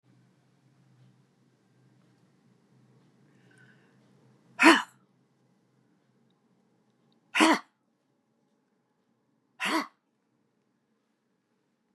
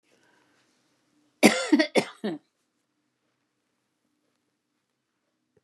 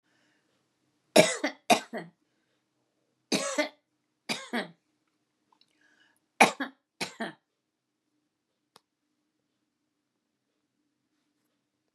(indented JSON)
{
  "exhalation_length": "11.9 s",
  "exhalation_amplitude": 20712,
  "exhalation_signal_mean_std_ratio": 0.18,
  "cough_length": "5.6 s",
  "cough_amplitude": 24014,
  "cough_signal_mean_std_ratio": 0.22,
  "three_cough_length": "11.9 s",
  "three_cough_amplitude": 22544,
  "three_cough_signal_mean_std_ratio": 0.2,
  "survey_phase": "beta (2021-08-13 to 2022-03-07)",
  "age": "65+",
  "gender": "Female",
  "wearing_mask": "No",
  "symptom_none": true,
  "smoker_status": "Ex-smoker",
  "respiratory_condition_asthma": false,
  "respiratory_condition_other": true,
  "recruitment_source": "REACT",
  "submission_delay": "1 day",
  "covid_test_result": "Negative",
  "covid_test_method": "RT-qPCR",
  "influenza_a_test_result": "Unknown/Void",
  "influenza_b_test_result": "Unknown/Void"
}